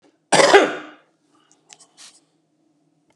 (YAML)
cough_length: 3.2 s
cough_amplitude: 32767
cough_signal_mean_std_ratio: 0.28
survey_phase: beta (2021-08-13 to 2022-03-07)
age: 65+
gender: Male
wearing_mask: 'No'
symptom_runny_or_blocked_nose: true
symptom_sore_throat: true
symptom_onset: 7 days
smoker_status: Never smoked
respiratory_condition_asthma: false
respiratory_condition_other: false
recruitment_source: REACT
submission_delay: 1 day
covid_test_result: Negative
covid_test_method: RT-qPCR
influenza_a_test_result: Negative
influenza_b_test_result: Negative